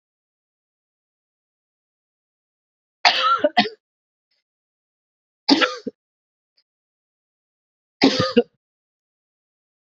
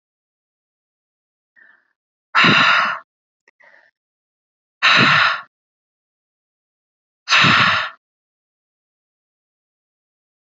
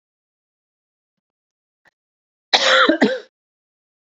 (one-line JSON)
{"three_cough_length": "9.9 s", "three_cough_amplitude": 30384, "three_cough_signal_mean_std_ratio": 0.24, "exhalation_length": "10.4 s", "exhalation_amplitude": 28459, "exhalation_signal_mean_std_ratio": 0.33, "cough_length": "4.1 s", "cough_amplitude": 29470, "cough_signal_mean_std_ratio": 0.3, "survey_phase": "beta (2021-08-13 to 2022-03-07)", "age": "45-64", "gender": "Female", "wearing_mask": "No", "symptom_cough_any": true, "symptom_runny_or_blocked_nose": true, "symptom_fatigue": true, "symptom_fever_high_temperature": true, "symptom_change_to_sense_of_smell_or_taste": true, "symptom_other": true, "symptom_onset": "3 days", "smoker_status": "Ex-smoker", "respiratory_condition_asthma": false, "respiratory_condition_other": false, "recruitment_source": "Test and Trace", "submission_delay": "2 days", "covid_test_result": "Positive", "covid_test_method": "RT-qPCR", "covid_ct_value": 15.9, "covid_ct_gene": "ORF1ab gene", "covid_ct_mean": 16.5, "covid_viral_load": "4000000 copies/ml", "covid_viral_load_category": "High viral load (>1M copies/ml)"}